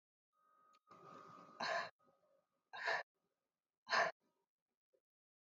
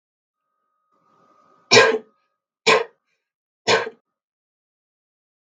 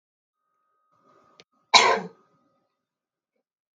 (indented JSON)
{
  "exhalation_length": "5.5 s",
  "exhalation_amplitude": 2156,
  "exhalation_signal_mean_std_ratio": 0.31,
  "three_cough_length": "5.5 s",
  "three_cough_amplitude": 32768,
  "three_cough_signal_mean_std_ratio": 0.25,
  "cough_length": "3.8 s",
  "cough_amplitude": 31523,
  "cough_signal_mean_std_ratio": 0.2,
  "survey_phase": "beta (2021-08-13 to 2022-03-07)",
  "age": "18-44",
  "gender": "Female",
  "wearing_mask": "No",
  "symptom_sore_throat": true,
  "smoker_status": "Never smoked",
  "respiratory_condition_asthma": false,
  "respiratory_condition_other": false,
  "recruitment_source": "REACT",
  "submission_delay": "0 days",
  "covid_test_result": "Negative",
  "covid_test_method": "RT-qPCR",
  "influenza_a_test_result": "Negative",
  "influenza_b_test_result": "Negative"
}